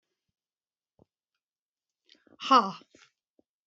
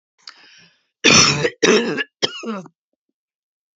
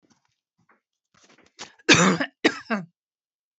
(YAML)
exhalation_length: 3.7 s
exhalation_amplitude: 13775
exhalation_signal_mean_std_ratio: 0.18
three_cough_length: 3.8 s
three_cough_amplitude: 31503
three_cough_signal_mean_std_ratio: 0.4
cough_length: 3.6 s
cough_amplitude: 30118
cough_signal_mean_std_ratio: 0.29
survey_phase: beta (2021-08-13 to 2022-03-07)
age: 45-64
gender: Female
wearing_mask: 'No'
symptom_none: true
smoker_status: Never smoked
respiratory_condition_asthma: true
respiratory_condition_other: false
recruitment_source: Test and Trace
submission_delay: 0 days
covid_test_result: Negative
covid_test_method: LFT